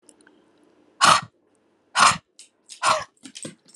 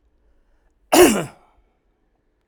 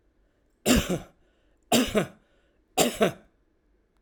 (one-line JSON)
{"exhalation_length": "3.8 s", "exhalation_amplitude": 27266, "exhalation_signal_mean_std_ratio": 0.32, "cough_length": "2.5 s", "cough_amplitude": 32768, "cough_signal_mean_std_ratio": 0.27, "three_cough_length": "4.0 s", "three_cough_amplitude": 15209, "three_cough_signal_mean_std_ratio": 0.38, "survey_phase": "alpha (2021-03-01 to 2021-08-12)", "age": "45-64", "gender": "Male", "wearing_mask": "No", "symptom_none": true, "smoker_status": "Current smoker (e-cigarettes or vapes only)", "respiratory_condition_asthma": false, "respiratory_condition_other": false, "recruitment_source": "REACT", "submission_delay": "1 day", "covid_test_result": "Negative", "covid_test_method": "RT-qPCR"}